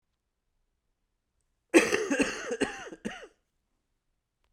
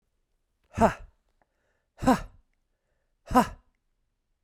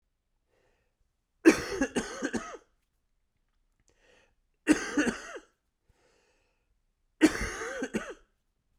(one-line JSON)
{"cough_length": "4.5 s", "cough_amplitude": 16786, "cough_signal_mean_std_ratio": 0.31, "exhalation_length": "4.4 s", "exhalation_amplitude": 14717, "exhalation_signal_mean_std_ratio": 0.25, "three_cough_length": "8.8 s", "three_cough_amplitude": 14439, "three_cough_signal_mean_std_ratio": 0.29, "survey_phase": "beta (2021-08-13 to 2022-03-07)", "age": "18-44", "gender": "Male", "wearing_mask": "No", "symptom_cough_any": true, "symptom_new_continuous_cough": true, "symptom_runny_or_blocked_nose": true, "symptom_abdominal_pain": true, "symptom_fatigue": true, "symptom_headache": true, "symptom_change_to_sense_of_smell_or_taste": true, "symptom_onset": "5 days", "smoker_status": "Never smoked", "respiratory_condition_asthma": false, "respiratory_condition_other": false, "recruitment_source": "Test and Trace", "submission_delay": "2 days", "covid_test_result": "Positive", "covid_test_method": "RT-qPCR"}